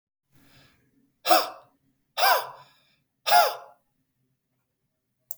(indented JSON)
{
  "exhalation_length": "5.4 s",
  "exhalation_amplitude": 18112,
  "exhalation_signal_mean_std_ratio": 0.29,
  "survey_phase": "beta (2021-08-13 to 2022-03-07)",
  "age": "45-64",
  "gender": "Male",
  "wearing_mask": "No",
  "symptom_none": true,
  "smoker_status": "Never smoked",
  "respiratory_condition_asthma": false,
  "respiratory_condition_other": false,
  "recruitment_source": "REACT",
  "submission_delay": "10 days",
  "covid_test_result": "Negative",
  "covid_test_method": "RT-qPCR",
  "influenza_a_test_result": "Negative",
  "influenza_b_test_result": "Negative"
}